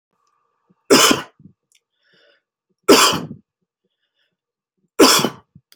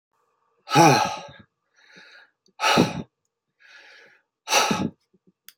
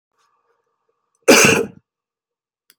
{
  "three_cough_length": "5.8 s",
  "three_cough_amplitude": 32468,
  "three_cough_signal_mean_std_ratio": 0.31,
  "exhalation_length": "5.6 s",
  "exhalation_amplitude": 21179,
  "exhalation_signal_mean_std_ratio": 0.36,
  "cough_length": "2.8 s",
  "cough_amplitude": 32699,
  "cough_signal_mean_std_ratio": 0.29,
  "survey_phase": "beta (2021-08-13 to 2022-03-07)",
  "age": "45-64",
  "gender": "Male",
  "wearing_mask": "No",
  "symptom_none": true,
  "smoker_status": "Ex-smoker",
  "respiratory_condition_asthma": false,
  "respiratory_condition_other": false,
  "recruitment_source": "REACT",
  "submission_delay": "1 day",
  "covid_test_result": "Negative",
  "covid_test_method": "RT-qPCR",
  "influenza_a_test_result": "Negative",
  "influenza_b_test_result": "Negative"
}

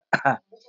{
  "three_cough_length": "0.7 s",
  "three_cough_amplitude": 21028,
  "three_cough_signal_mean_std_ratio": 0.38,
  "survey_phase": "beta (2021-08-13 to 2022-03-07)",
  "age": "65+",
  "gender": "Female",
  "wearing_mask": "Prefer not to say",
  "symptom_none": true,
  "smoker_status": "Never smoked",
  "respiratory_condition_asthma": false,
  "respiratory_condition_other": false,
  "recruitment_source": "REACT",
  "submission_delay": "2 days",
  "covid_test_result": "Negative",
  "covid_test_method": "RT-qPCR",
  "influenza_a_test_result": "Negative",
  "influenza_b_test_result": "Negative"
}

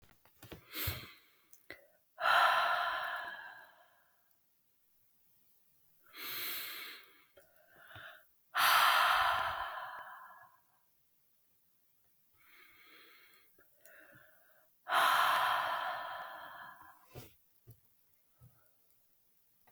{
  "exhalation_length": "19.7 s",
  "exhalation_amplitude": 5249,
  "exhalation_signal_mean_std_ratio": 0.4,
  "survey_phase": "beta (2021-08-13 to 2022-03-07)",
  "age": "18-44",
  "gender": "Female",
  "wearing_mask": "No",
  "symptom_cough_any": true,
  "symptom_runny_or_blocked_nose": true,
  "symptom_sore_throat": true,
  "symptom_headache": true,
  "symptom_change_to_sense_of_smell_or_taste": true,
  "symptom_onset": "3 days",
  "smoker_status": "Never smoked",
  "respiratory_condition_asthma": false,
  "respiratory_condition_other": false,
  "recruitment_source": "Test and Trace",
  "submission_delay": "1 day",
  "covid_test_result": "Positive",
  "covid_test_method": "RT-qPCR",
  "covid_ct_value": 20.2,
  "covid_ct_gene": "ORF1ab gene",
  "covid_ct_mean": 20.3,
  "covid_viral_load": "220000 copies/ml",
  "covid_viral_load_category": "Low viral load (10K-1M copies/ml)"
}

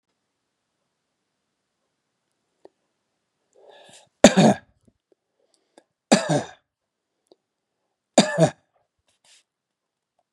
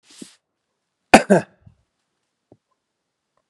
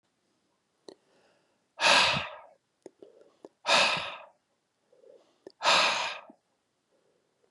{
  "three_cough_length": "10.3 s",
  "three_cough_amplitude": 32768,
  "three_cough_signal_mean_std_ratio": 0.19,
  "cough_length": "3.5 s",
  "cough_amplitude": 32768,
  "cough_signal_mean_std_ratio": 0.17,
  "exhalation_length": "7.5 s",
  "exhalation_amplitude": 12592,
  "exhalation_signal_mean_std_ratio": 0.34,
  "survey_phase": "beta (2021-08-13 to 2022-03-07)",
  "age": "65+",
  "gender": "Male",
  "wearing_mask": "No",
  "symptom_none": true,
  "smoker_status": "Ex-smoker",
  "respiratory_condition_asthma": false,
  "respiratory_condition_other": false,
  "recruitment_source": "REACT",
  "submission_delay": "1 day",
  "covid_test_result": "Negative",
  "covid_test_method": "RT-qPCR",
  "influenza_a_test_result": "Negative",
  "influenza_b_test_result": "Negative"
}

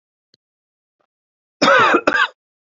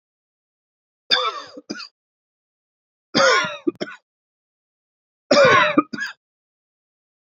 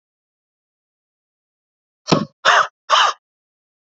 {
  "cough_length": "2.6 s",
  "cough_amplitude": 32767,
  "cough_signal_mean_std_ratio": 0.39,
  "three_cough_length": "7.3 s",
  "three_cough_amplitude": 27339,
  "three_cough_signal_mean_std_ratio": 0.33,
  "exhalation_length": "3.9 s",
  "exhalation_amplitude": 29439,
  "exhalation_signal_mean_std_ratio": 0.3,
  "survey_phase": "beta (2021-08-13 to 2022-03-07)",
  "age": "45-64",
  "gender": "Male",
  "wearing_mask": "No",
  "symptom_none": true,
  "smoker_status": "Never smoked",
  "respiratory_condition_asthma": false,
  "respiratory_condition_other": false,
  "recruitment_source": "REACT",
  "submission_delay": "1 day",
  "covid_test_result": "Negative",
  "covid_test_method": "RT-qPCR",
  "influenza_a_test_result": "Negative",
  "influenza_b_test_result": "Negative"
}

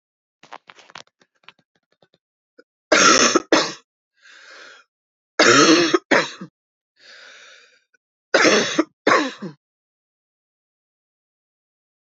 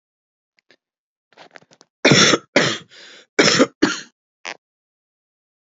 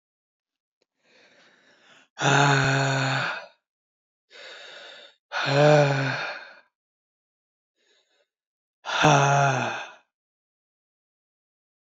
{
  "three_cough_length": "12.0 s",
  "three_cough_amplitude": 31159,
  "three_cough_signal_mean_std_ratio": 0.33,
  "cough_length": "5.6 s",
  "cough_amplitude": 30865,
  "cough_signal_mean_std_ratio": 0.32,
  "exhalation_length": "11.9 s",
  "exhalation_amplitude": 19372,
  "exhalation_signal_mean_std_ratio": 0.41,
  "survey_phase": "beta (2021-08-13 to 2022-03-07)",
  "age": "45-64",
  "gender": "Female",
  "wearing_mask": "No",
  "symptom_cough_any": true,
  "symptom_runny_or_blocked_nose": true,
  "symptom_sore_throat": true,
  "symptom_fatigue": true,
  "symptom_headache": true,
  "symptom_other": true,
  "symptom_onset": "2 days",
  "smoker_status": "Ex-smoker",
  "respiratory_condition_asthma": true,
  "respiratory_condition_other": false,
  "recruitment_source": "Test and Trace",
  "submission_delay": "1 day",
  "covid_test_result": "Positive",
  "covid_test_method": "RT-qPCR",
  "covid_ct_value": 24.6,
  "covid_ct_gene": "ORF1ab gene",
  "covid_ct_mean": 24.9,
  "covid_viral_load": "6600 copies/ml",
  "covid_viral_load_category": "Minimal viral load (< 10K copies/ml)"
}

